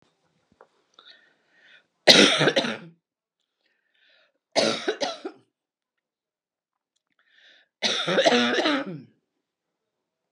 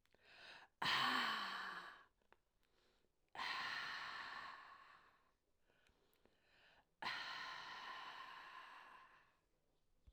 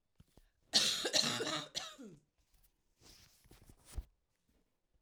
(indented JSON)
{
  "three_cough_length": "10.3 s",
  "three_cough_amplitude": 32767,
  "three_cough_signal_mean_std_ratio": 0.33,
  "exhalation_length": "10.1 s",
  "exhalation_amplitude": 1538,
  "exhalation_signal_mean_std_ratio": 0.5,
  "cough_length": "5.0 s",
  "cough_amplitude": 6957,
  "cough_signal_mean_std_ratio": 0.36,
  "survey_phase": "alpha (2021-03-01 to 2021-08-12)",
  "age": "65+",
  "gender": "Female",
  "wearing_mask": "No",
  "symptom_cough_any": true,
  "smoker_status": "Ex-smoker",
  "respiratory_condition_asthma": false,
  "respiratory_condition_other": false,
  "recruitment_source": "REACT",
  "submission_delay": "3 days",
  "covid_test_result": "Negative",
  "covid_test_method": "RT-qPCR"
}